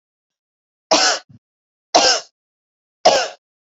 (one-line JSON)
{"three_cough_length": "3.8 s", "three_cough_amplitude": 32768, "three_cough_signal_mean_std_ratio": 0.35, "survey_phase": "beta (2021-08-13 to 2022-03-07)", "age": "18-44", "gender": "Female", "wearing_mask": "No", "symptom_runny_or_blocked_nose": true, "symptom_fatigue": true, "smoker_status": "Never smoked", "respiratory_condition_asthma": false, "respiratory_condition_other": false, "recruitment_source": "Test and Trace", "submission_delay": "2 days", "covid_test_result": "Positive", "covid_test_method": "ePCR"}